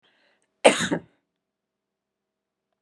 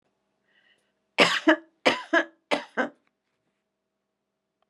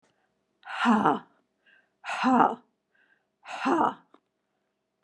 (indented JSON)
{
  "cough_length": "2.8 s",
  "cough_amplitude": 31154,
  "cough_signal_mean_std_ratio": 0.2,
  "three_cough_length": "4.7 s",
  "three_cough_amplitude": 24036,
  "three_cough_signal_mean_std_ratio": 0.28,
  "exhalation_length": "5.0 s",
  "exhalation_amplitude": 15650,
  "exhalation_signal_mean_std_ratio": 0.39,
  "survey_phase": "beta (2021-08-13 to 2022-03-07)",
  "age": "65+",
  "gender": "Female",
  "wearing_mask": "No",
  "symptom_cough_any": true,
  "symptom_runny_or_blocked_nose": true,
  "symptom_onset": "4 days",
  "smoker_status": "Never smoked",
  "respiratory_condition_asthma": false,
  "respiratory_condition_other": false,
  "recruitment_source": "REACT",
  "submission_delay": "1 day",
  "covid_test_result": "Negative",
  "covid_test_method": "RT-qPCR",
  "influenza_a_test_result": "Negative",
  "influenza_b_test_result": "Negative"
}